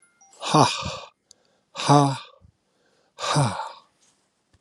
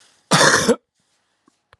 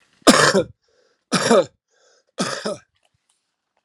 exhalation_length: 4.6 s
exhalation_amplitude: 25595
exhalation_signal_mean_std_ratio: 0.38
cough_length: 1.8 s
cough_amplitude: 30273
cough_signal_mean_std_ratio: 0.4
three_cough_length: 3.8 s
three_cough_amplitude: 32767
three_cough_signal_mean_std_ratio: 0.36
survey_phase: beta (2021-08-13 to 2022-03-07)
age: 45-64
gender: Male
wearing_mask: 'No'
symptom_cough_any: true
symptom_new_continuous_cough: true
symptom_runny_or_blocked_nose: true
symptom_fatigue: true
symptom_headache: true
symptom_other: true
smoker_status: Never smoked
respiratory_condition_asthma: false
respiratory_condition_other: false
recruitment_source: Test and Trace
submission_delay: 2 days
covid_test_result: Positive
covid_test_method: RT-qPCR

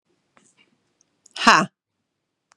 exhalation_length: 2.6 s
exhalation_amplitude: 32767
exhalation_signal_mean_std_ratio: 0.21
survey_phase: beta (2021-08-13 to 2022-03-07)
age: 45-64
gender: Female
wearing_mask: 'No'
symptom_other: true
smoker_status: Ex-smoker
respiratory_condition_asthma: true
respiratory_condition_other: false
recruitment_source: Test and Trace
submission_delay: 2 days
covid_test_result: Positive
covid_test_method: LFT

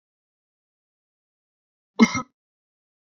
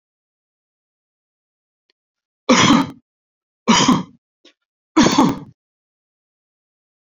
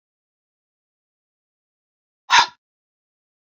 cough_length: 3.2 s
cough_amplitude: 24691
cough_signal_mean_std_ratio: 0.15
three_cough_length: 7.2 s
three_cough_amplitude: 32768
three_cough_signal_mean_std_ratio: 0.31
exhalation_length: 3.5 s
exhalation_amplitude: 28420
exhalation_signal_mean_std_ratio: 0.16
survey_phase: beta (2021-08-13 to 2022-03-07)
age: 45-64
gender: Male
wearing_mask: 'No'
symptom_none: true
smoker_status: Never smoked
respiratory_condition_asthma: false
respiratory_condition_other: false
recruitment_source: REACT
submission_delay: 2 days
covid_test_result: Negative
covid_test_method: RT-qPCR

